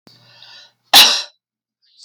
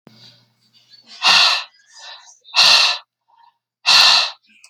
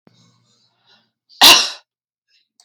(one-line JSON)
{"cough_length": "2.0 s", "cough_amplitude": 31733, "cough_signal_mean_std_ratio": 0.3, "exhalation_length": "4.7 s", "exhalation_amplitude": 32768, "exhalation_signal_mean_std_ratio": 0.44, "three_cough_length": "2.6 s", "three_cough_amplitude": 32768, "three_cough_signal_mean_std_ratio": 0.26, "survey_phase": "beta (2021-08-13 to 2022-03-07)", "age": "45-64", "gender": "Female", "wearing_mask": "No", "symptom_cough_any": true, "symptom_runny_or_blocked_nose": true, "symptom_fatigue": true, "symptom_change_to_sense_of_smell_or_taste": true, "symptom_onset": "5 days", "smoker_status": "Ex-smoker", "respiratory_condition_asthma": false, "respiratory_condition_other": false, "recruitment_source": "Test and Trace", "submission_delay": "1 day", "covid_test_result": "Positive", "covid_test_method": "RT-qPCR", "covid_ct_value": 21.2, "covid_ct_gene": "N gene"}